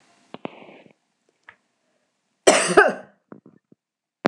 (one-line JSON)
{"cough_length": "4.3 s", "cough_amplitude": 26028, "cough_signal_mean_std_ratio": 0.25, "survey_phase": "beta (2021-08-13 to 2022-03-07)", "age": "45-64", "gender": "Female", "wearing_mask": "Yes", "symptom_none": true, "smoker_status": "Never smoked", "respiratory_condition_asthma": false, "respiratory_condition_other": false, "recruitment_source": "REACT", "submission_delay": "3 days", "covid_test_result": "Negative", "covid_test_method": "RT-qPCR"}